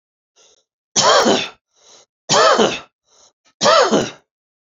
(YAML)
three_cough_length: 4.8 s
three_cough_amplitude: 30656
three_cough_signal_mean_std_ratio: 0.45
survey_phase: beta (2021-08-13 to 2022-03-07)
age: 45-64
gender: Male
wearing_mask: 'No'
symptom_runny_or_blocked_nose: true
symptom_onset: 11 days
smoker_status: Never smoked
respiratory_condition_asthma: true
respiratory_condition_other: false
recruitment_source: REACT
submission_delay: 2 days
covid_test_result: Negative
covid_test_method: RT-qPCR
influenza_a_test_result: Unknown/Void
influenza_b_test_result: Unknown/Void